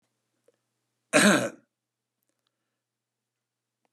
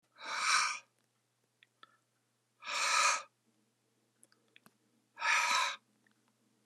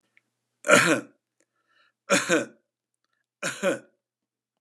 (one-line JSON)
{"cough_length": "3.9 s", "cough_amplitude": 17448, "cough_signal_mean_std_ratio": 0.23, "exhalation_length": "6.7 s", "exhalation_amplitude": 5203, "exhalation_signal_mean_std_ratio": 0.4, "three_cough_length": "4.6 s", "three_cough_amplitude": 28085, "three_cough_signal_mean_std_ratio": 0.32, "survey_phase": "beta (2021-08-13 to 2022-03-07)", "age": "45-64", "gender": "Male", "wearing_mask": "No", "symptom_none": true, "smoker_status": "Never smoked", "respiratory_condition_asthma": false, "respiratory_condition_other": false, "recruitment_source": "REACT", "submission_delay": "3 days", "covid_test_result": "Negative", "covid_test_method": "RT-qPCR", "influenza_a_test_result": "Negative", "influenza_b_test_result": "Negative"}